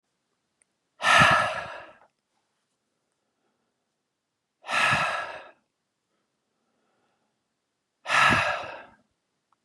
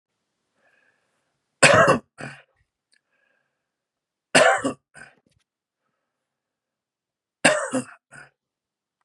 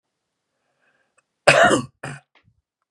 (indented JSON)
{
  "exhalation_length": "9.6 s",
  "exhalation_amplitude": 17091,
  "exhalation_signal_mean_std_ratio": 0.33,
  "three_cough_length": "9.0 s",
  "three_cough_amplitude": 32472,
  "three_cough_signal_mean_std_ratio": 0.25,
  "cough_length": "2.9 s",
  "cough_amplitude": 32768,
  "cough_signal_mean_std_ratio": 0.28,
  "survey_phase": "beta (2021-08-13 to 2022-03-07)",
  "age": "45-64",
  "gender": "Male",
  "wearing_mask": "No",
  "symptom_none": true,
  "symptom_onset": "3 days",
  "smoker_status": "Ex-smoker",
  "respiratory_condition_asthma": false,
  "respiratory_condition_other": false,
  "recruitment_source": "REACT",
  "submission_delay": "3 days",
  "covid_test_result": "Negative",
  "covid_test_method": "RT-qPCR",
  "influenza_a_test_result": "Negative",
  "influenza_b_test_result": "Negative"
}